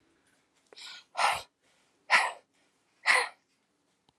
{"exhalation_length": "4.2 s", "exhalation_amplitude": 10633, "exhalation_signal_mean_std_ratio": 0.31, "survey_phase": "alpha (2021-03-01 to 2021-08-12)", "age": "45-64", "gender": "Female", "wearing_mask": "No", "symptom_none": true, "smoker_status": "Never smoked", "respiratory_condition_asthma": false, "respiratory_condition_other": false, "recruitment_source": "REACT", "submission_delay": "1 day", "covid_test_result": "Negative", "covid_test_method": "RT-qPCR"}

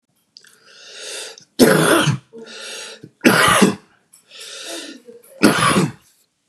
{"three_cough_length": "6.5 s", "three_cough_amplitude": 32768, "three_cough_signal_mean_std_ratio": 0.45, "survey_phase": "beta (2021-08-13 to 2022-03-07)", "age": "45-64", "gender": "Male", "wearing_mask": "No", "symptom_runny_or_blocked_nose": true, "symptom_sore_throat": true, "symptom_onset": "5 days", "smoker_status": "Never smoked", "respiratory_condition_asthma": false, "respiratory_condition_other": false, "recruitment_source": "REACT", "submission_delay": "2 days", "covid_test_result": "Negative", "covid_test_method": "RT-qPCR", "influenza_a_test_result": "Negative", "influenza_b_test_result": "Negative"}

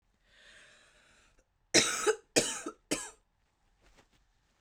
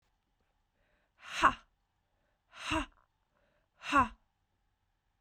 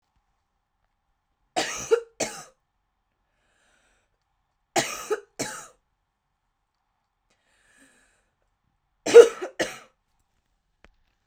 {"cough_length": "4.6 s", "cough_amplitude": 11325, "cough_signal_mean_std_ratio": 0.3, "exhalation_length": "5.2 s", "exhalation_amplitude": 9270, "exhalation_signal_mean_std_ratio": 0.24, "three_cough_length": "11.3 s", "three_cough_amplitude": 32768, "three_cough_signal_mean_std_ratio": 0.17, "survey_phase": "beta (2021-08-13 to 2022-03-07)", "age": "18-44", "gender": "Female", "wearing_mask": "No", "symptom_cough_any": true, "symptom_new_continuous_cough": true, "symptom_runny_or_blocked_nose": true, "symptom_shortness_of_breath": true, "symptom_sore_throat": true, "symptom_fatigue": true, "symptom_fever_high_temperature": true, "symptom_headache": true, "symptom_onset": "2 days", "smoker_status": "Never smoked", "respiratory_condition_asthma": true, "respiratory_condition_other": false, "recruitment_source": "REACT", "submission_delay": "2 days", "covid_test_result": "Positive", "covid_test_method": "RT-qPCR", "covid_ct_value": 25.4, "covid_ct_gene": "E gene", "influenza_a_test_result": "Negative", "influenza_b_test_result": "Negative"}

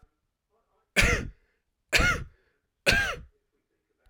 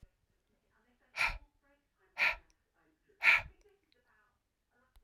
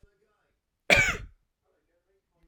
{"three_cough_length": "4.1 s", "three_cough_amplitude": 19075, "three_cough_signal_mean_std_ratio": 0.36, "exhalation_length": "5.0 s", "exhalation_amplitude": 7523, "exhalation_signal_mean_std_ratio": 0.25, "cough_length": "2.5 s", "cough_amplitude": 21009, "cough_signal_mean_std_ratio": 0.25, "survey_phase": "alpha (2021-03-01 to 2021-08-12)", "age": "45-64", "gender": "Male", "wearing_mask": "No", "symptom_none": true, "smoker_status": "Never smoked", "respiratory_condition_asthma": false, "respiratory_condition_other": false, "recruitment_source": "REACT", "submission_delay": "2 days", "covid_test_result": "Negative", "covid_test_method": "RT-qPCR"}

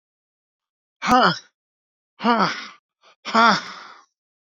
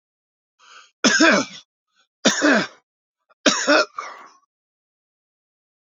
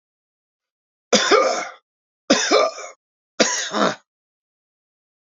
{"exhalation_length": "4.4 s", "exhalation_amplitude": 26333, "exhalation_signal_mean_std_ratio": 0.35, "cough_length": "5.8 s", "cough_amplitude": 28259, "cough_signal_mean_std_ratio": 0.36, "three_cough_length": "5.3 s", "three_cough_amplitude": 28541, "three_cough_signal_mean_std_ratio": 0.4, "survey_phase": "beta (2021-08-13 to 2022-03-07)", "age": "65+", "gender": "Male", "wearing_mask": "No", "symptom_none": true, "smoker_status": "Never smoked", "respiratory_condition_asthma": true, "respiratory_condition_other": false, "recruitment_source": "REACT", "submission_delay": "1 day", "covid_test_result": "Negative", "covid_test_method": "RT-qPCR", "influenza_a_test_result": "Negative", "influenza_b_test_result": "Negative"}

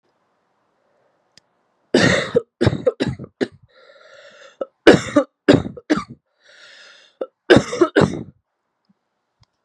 {"three_cough_length": "9.6 s", "three_cough_amplitude": 32768, "three_cough_signal_mean_std_ratio": 0.31, "survey_phase": "beta (2021-08-13 to 2022-03-07)", "age": "18-44", "gender": "Female", "wearing_mask": "No", "symptom_cough_any": true, "symptom_runny_or_blocked_nose": true, "symptom_sore_throat": true, "symptom_headache": true, "symptom_onset": "5 days", "smoker_status": "Never smoked", "respiratory_condition_asthma": true, "respiratory_condition_other": false, "recruitment_source": "Test and Trace", "submission_delay": "2 days", "covid_test_result": "Positive", "covid_test_method": "RT-qPCR", "covid_ct_value": 22.8, "covid_ct_gene": "S gene", "covid_ct_mean": 22.9, "covid_viral_load": "30000 copies/ml", "covid_viral_load_category": "Low viral load (10K-1M copies/ml)"}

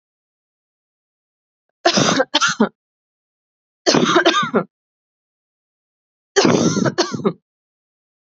{"three_cough_length": "8.4 s", "three_cough_amplitude": 32214, "three_cough_signal_mean_std_ratio": 0.4, "survey_phase": "beta (2021-08-13 to 2022-03-07)", "age": "18-44", "gender": "Female", "wearing_mask": "No", "symptom_new_continuous_cough": true, "symptom_runny_or_blocked_nose": true, "symptom_sore_throat": true, "symptom_fatigue": true, "symptom_fever_high_temperature": true, "symptom_headache": true, "symptom_onset": "3 days", "smoker_status": "Ex-smoker", "respiratory_condition_asthma": false, "respiratory_condition_other": false, "recruitment_source": "Test and Trace", "submission_delay": "1 day", "covid_test_result": "Positive", "covid_test_method": "ePCR"}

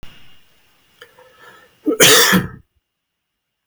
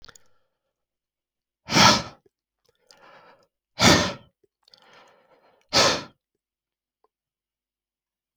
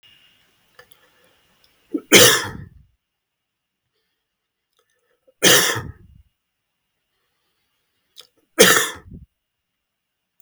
{"cough_length": "3.7 s", "cough_amplitude": 32768, "cough_signal_mean_std_ratio": 0.34, "exhalation_length": "8.4 s", "exhalation_amplitude": 26269, "exhalation_signal_mean_std_ratio": 0.25, "three_cough_length": "10.4 s", "three_cough_amplitude": 32768, "three_cough_signal_mean_std_ratio": 0.24, "survey_phase": "beta (2021-08-13 to 2022-03-07)", "age": "65+", "gender": "Male", "wearing_mask": "No", "symptom_none": true, "smoker_status": "Ex-smoker", "respiratory_condition_asthma": false, "respiratory_condition_other": false, "recruitment_source": "REACT", "submission_delay": "2 days", "covid_test_result": "Negative", "covid_test_method": "RT-qPCR", "influenza_a_test_result": "Unknown/Void", "influenza_b_test_result": "Unknown/Void"}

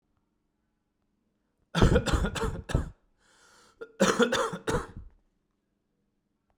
{"cough_length": "6.6 s", "cough_amplitude": 16313, "cough_signal_mean_std_ratio": 0.37, "survey_phase": "beta (2021-08-13 to 2022-03-07)", "age": "18-44", "gender": "Male", "wearing_mask": "No", "symptom_cough_any": true, "symptom_runny_or_blocked_nose": true, "symptom_onset": "6 days", "smoker_status": "Never smoked", "respiratory_condition_asthma": true, "respiratory_condition_other": false, "recruitment_source": "REACT", "submission_delay": "1 day", "covid_test_result": "Negative", "covid_test_method": "RT-qPCR", "influenza_a_test_result": "Unknown/Void", "influenza_b_test_result": "Unknown/Void"}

